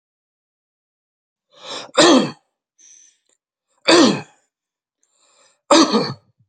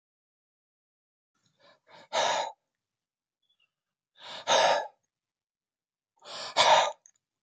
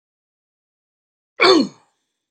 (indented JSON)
{
  "three_cough_length": "6.5 s",
  "three_cough_amplitude": 32768,
  "three_cough_signal_mean_std_ratio": 0.32,
  "exhalation_length": "7.4 s",
  "exhalation_amplitude": 12970,
  "exhalation_signal_mean_std_ratio": 0.31,
  "cough_length": "2.3 s",
  "cough_amplitude": 28847,
  "cough_signal_mean_std_ratio": 0.27,
  "survey_phase": "beta (2021-08-13 to 2022-03-07)",
  "age": "18-44",
  "gender": "Male",
  "wearing_mask": "No",
  "symptom_none": true,
  "smoker_status": "Never smoked",
  "respiratory_condition_asthma": false,
  "respiratory_condition_other": false,
  "recruitment_source": "REACT",
  "submission_delay": "2 days",
  "covid_test_result": "Negative",
  "covid_test_method": "RT-qPCR"
}